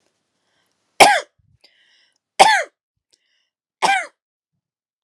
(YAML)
three_cough_length: 5.0 s
three_cough_amplitude: 32768
three_cough_signal_mean_std_ratio: 0.26
survey_phase: beta (2021-08-13 to 2022-03-07)
age: 18-44
gender: Female
wearing_mask: 'No'
symptom_none: true
smoker_status: Never smoked
respiratory_condition_asthma: false
respiratory_condition_other: false
recruitment_source: REACT
submission_delay: 1 day
covid_test_result: Negative
covid_test_method: RT-qPCR